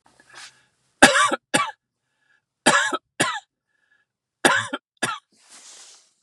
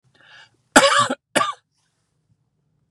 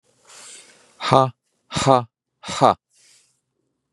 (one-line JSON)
{"three_cough_length": "6.2 s", "three_cough_amplitude": 32768, "three_cough_signal_mean_std_ratio": 0.33, "cough_length": "2.9 s", "cough_amplitude": 32768, "cough_signal_mean_std_ratio": 0.31, "exhalation_length": "3.9 s", "exhalation_amplitude": 32767, "exhalation_signal_mean_std_ratio": 0.29, "survey_phase": "beta (2021-08-13 to 2022-03-07)", "age": "45-64", "gender": "Male", "wearing_mask": "No", "symptom_none": true, "smoker_status": "Never smoked", "respiratory_condition_asthma": false, "respiratory_condition_other": false, "recruitment_source": "REACT", "submission_delay": "2 days", "covid_test_result": "Negative", "covid_test_method": "RT-qPCR", "influenza_a_test_result": "Negative", "influenza_b_test_result": "Negative"}